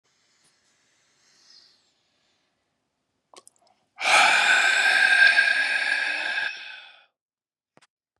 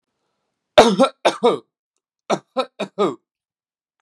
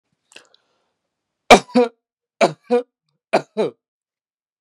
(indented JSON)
{
  "exhalation_length": "8.2 s",
  "exhalation_amplitude": 18389,
  "exhalation_signal_mean_std_ratio": 0.46,
  "cough_length": "4.0 s",
  "cough_amplitude": 32768,
  "cough_signal_mean_std_ratio": 0.32,
  "three_cough_length": "4.6 s",
  "three_cough_amplitude": 32768,
  "three_cough_signal_mean_std_ratio": 0.25,
  "survey_phase": "beta (2021-08-13 to 2022-03-07)",
  "age": "18-44",
  "gender": "Male",
  "wearing_mask": "Yes",
  "symptom_sore_throat": true,
  "symptom_fatigue": true,
  "symptom_headache": true,
  "smoker_status": "Never smoked",
  "respiratory_condition_asthma": false,
  "respiratory_condition_other": false,
  "recruitment_source": "Test and Trace",
  "submission_delay": "3 days",
  "covid_test_result": "Positive",
  "covid_test_method": "RT-qPCR",
  "covid_ct_value": 24.5,
  "covid_ct_gene": "ORF1ab gene"
}